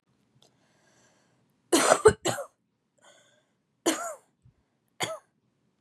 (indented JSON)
{
  "three_cough_length": "5.8 s",
  "three_cough_amplitude": 22322,
  "three_cough_signal_mean_std_ratio": 0.25,
  "survey_phase": "beta (2021-08-13 to 2022-03-07)",
  "age": "18-44",
  "gender": "Female",
  "wearing_mask": "No",
  "symptom_cough_any": true,
  "symptom_sore_throat": true,
  "symptom_onset": "13 days",
  "smoker_status": "Never smoked",
  "respiratory_condition_asthma": false,
  "respiratory_condition_other": false,
  "recruitment_source": "REACT",
  "submission_delay": "4 days",
  "covid_test_result": "Negative",
  "covid_test_method": "RT-qPCR"
}